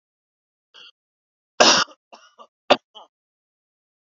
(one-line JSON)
{"three_cough_length": "4.2 s", "three_cough_amplitude": 28760, "three_cough_signal_mean_std_ratio": 0.21, "survey_phase": "beta (2021-08-13 to 2022-03-07)", "age": "18-44", "gender": "Male", "wearing_mask": "No", "symptom_none": true, "smoker_status": "Ex-smoker", "respiratory_condition_asthma": false, "respiratory_condition_other": false, "recruitment_source": "REACT", "submission_delay": "4 days", "covid_test_result": "Negative", "covid_test_method": "RT-qPCR", "influenza_a_test_result": "Negative", "influenza_b_test_result": "Negative"}